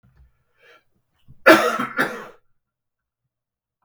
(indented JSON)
{
  "cough_length": "3.8 s",
  "cough_amplitude": 32768,
  "cough_signal_mean_std_ratio": 0.26,
  "survey_phase": "beta (2021-08-13 to 2022-03-07)",
  "age": "45-64",
  "gender": "Male",
  "wearing_mask": "No",
  "symptom_cough_any": true,
  "symptom_runny_or_blocked_nose": true,
  "symptom_sore_throat": true,
  "symptom_fatigue": true,
  "symptom_headache": true,
  "symptom_onset": "3 days",
  "smoker_status": "Ex-smoker",
  "respiratory_condition_asthma": false,
  "respiratory_condition_other": false,
  "recruitment_source": "Test and Trace",
  "submission_delay": "2 days",
  "covid_test_result": "Positive",
  "covid_test_method": "RT-qPCR",
  "covid_ct_value": 22.1,
  "covid_ct_gene": "N gene"
}